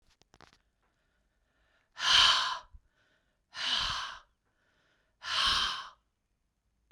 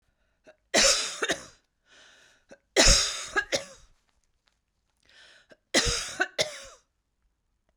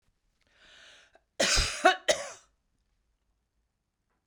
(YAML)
exhalation_length: 6.9 s
exhalation_amplitude: 10185
exhalation_signal_mean_std_ratio: 0.37
three_cough_length: 7.8 s
three_cough_amplitude: 20633
three_cough_signal_mean_std_ratio: 0.35
cough_length: 4.3 s
cough_amplitude: 14058
cough_signal_mean_std_ratio: 0.29
survey_phase: beta (2021-08-13 to 2022-03-07)
age: 65+
gender: Female
wearing_mask: 'No'
symptom_none: true
smoker_status: Ex-smoker
respiratory_condition_asthma: false
respiratory_condition_other: true
recruitment_source: REACT
submission_delay: 1 day
covid_test_result: Negative
covid_test_method: RT-qPCR
influenza_a_test_result: Negative
influenza_b_test_result: Negative